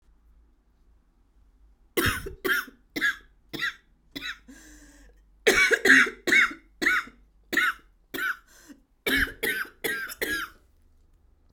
{"three_cough_length": "11.5 s", "three_cough_amplitude": 19836, "three_cough_signal_mean_std_ratio": 0.42, "survey_phase": "alpha (2021-03-01 to 2021-08-12)", "age": "18-44", "gender": "Female", "wearing_mask": "No", "symptom_cough_any": true, "symptom_headache": true, "smoker_status": "Ex-smoker", "respiratory_condition_asthma": false, "respiratory_condition_other": false, "recruitment_source": "Test and Trace", "submission_delay": "2 days", "covid_test_result": "Positive", "covid_test_method": "RT-qPCR", "covid_ct_value": 23.1, "covid_ct_gene": "ORF1ab gene", "covid_ct_mean": 23.8, "covid_viral_load": "15000 copies/ml", "covid_viral_load_category": "Low viral load (10K-1M copies/ml)"}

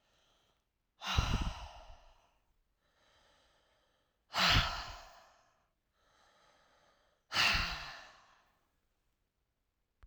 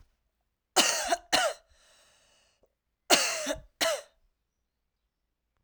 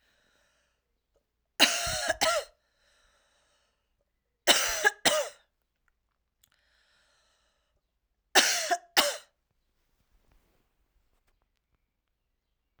{"exhalation_length": "10.1 s", "exhalation_amplitude": 5165, "exhalation_signal_mean_std_ratio": 0.32, "cough_length": "5.6 s", "cough_amplitude": 18276, "cough_signal_mean_std_ratio": 0.35, "three_cough_length": "12.8 s", "three_cough_amplitude": 20740, "three_cough_signal_mean_std_ratio": 0.28, "survey_phase": "alpha (2021-03-01 to 2021-08-12)", "age": "45-64", "gender": "Female", "wearing_mask": "No", "symptom_cough_any": true, "symptom_fatigue": true, "symptom_headache": true, "smoker_status": "Never smoked", "respiratory_condition_asthma": true, "respiratory_condition_other": false, "recruitment_source": "Test and Trace", "submission_delay": "1 day", "covid_test_result": "Positive", "covid_test_method": "RT-qPCR", "covid_ct_value": 31.0, "covid_ct_gene": "ORF1ab gene", "covid_ct_mean": 32.2, "covid_viral_load": "26 copies/ml", "covid_viral_load_category": "Minimal viral load (< 10K copies/ml)"}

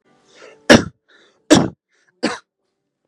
{"three_cough_length": "3.1 s", "three_cough_amplitude": 32768, "three_cough_signal_mean_std_ratio": 0.26, "survey_phase": "beta (2021-08-13 to 2022-03-07)", "age": "18-44", "gender": "Male", "wearing_mask": "Yes", "symptom_none": true, "smoker_status": "Never smoked", "respiratory_condition_asthma": false, "respiratory_condition_other": false, "recruitment_source": "REACT", "submission_delay": "2 days", "covid_test_result": "Negative", "covid_test_method": "RT-qPCR", "influenza_a_test_result": "Negative", "influenza_b_test_result": "Negative"}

